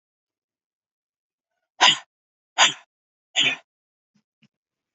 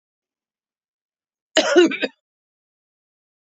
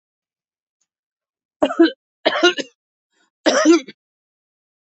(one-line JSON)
{"exhalation_length": "4.9 s", "exhalation_amplitude": 25506, "exhalation_signal_mean_std_ratio": 0.23, "cough_length": "3.4 s", "cough_amplitude": 26966, "cough_signal_mean_std_ratio": 0.27, "three_cough_length": "4.9 s", "three_cough_amplitude": 26819, "three_cough_signal_mean_std_ratio": 0.32, "survey_phase": "beta (2021-08-13 to 2022-03-07)", "age": "65+", "gender": "Female", "wearing_mask": "No", "symptom_none": true, "smoker_status": "Never smoked", "respiratory_condition_asthma": false, "respiratory_condition_other": false, "recruitment_source": "Test and Trace", "submission_delay": "1 day", "covid_test_result": "Negative", "covid_test_method": "ePCR"}